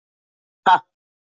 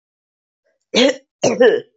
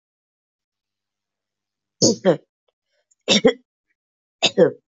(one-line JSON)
{"exhalation_length": "1.3 s", "exhalation_amplitude": 24013, "exhalation_signal_mean_std_ratio": 0.25, "cough_length": "2.0 s", "cough_amplitude": 26721, "cough_signal_mean_std_ratio": 0.43, "three_cough_length": "4.9 s", "three_cough_amplitude": 26447, "three_cough_signal_mean_std_ratio": 0.28, "survey_phase": "beta (2021-08-13 to 2022-03-07)", "age": "45-64", "gender": "Female", "wearing_mask": "No", "symptom_cough_any": true, "symptom_runny_or_blocked_nose": true, "symptom_abdominal_pain": true, "symptom_fatigue": true, "smoker_status": "Ex-smoker", "respiratory_condition_asthma": false, "respiratory_condition_other": false, "recruitment_source": "Test and Trace", "submission_delay": "1 day", "covid_test_result": "Positive", "covid_test_method": "LFT"}